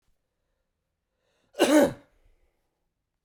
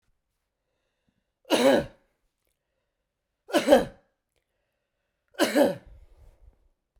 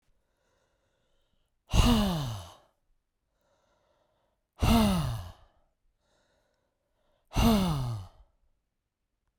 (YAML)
cough_length: 3.2 s
cough_amplitude: 13758
cough_signal_mean_std_ratio: 0.25
three_cough_length: 7.0 s
three_cough_amplitude: 20149
three_cough_signal_mean_std_ratio: 0.28
exhalation_length: 9.4 s
exhalation_amplitude: 11148
exhalation_signal_mean_std_ratio: 0.36
survey_phase: beta (2021-08-13 to 2022-03-07)
age: 45-64
gender: Male
wearing_mask: 'No'
symptom_none: true
smoker_status: Never smoked
respiratory_condition_asthma: false
respiratory_condition_other: false
recruitment_source: REACT
submission_delay: 0 days
covid_test_result: Negative
covid_test_method: RT-qPCR
influenza_a_test_result: Negative
influenza_b_test_result: Negative